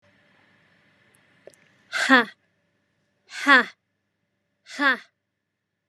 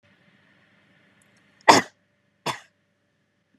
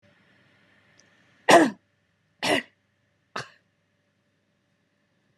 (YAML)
exhalation_length: 5.9 s
exhalation_amplitude: 28746
exhalation_signal_mean_std_ratio: 0.25
cough_length: 3.6 s
cough_amplitude: 32768
cough_signal_mean_std_ratio: 0.17
three_cough_length: 5.4 s
three_cough_amplitude: 26196
three_cough_signal_mean_std_ratio: 0.21
survey_phase: beta (2021-08-13 to 2022-03-07)
age: 18-44
gender: Female
wearing_mask: 'No'
symptom_none: true
smoker_status: Never smoked
respiratory_condition_asthma: false
respiratory_condition_other: false
recruitment_source: REACT
submission_delay: 1 day
covid_test_result: Negative
covid_test_method: RT-qPCR
influenza_a_test_result: Negative
influenza_b_test_result: Negative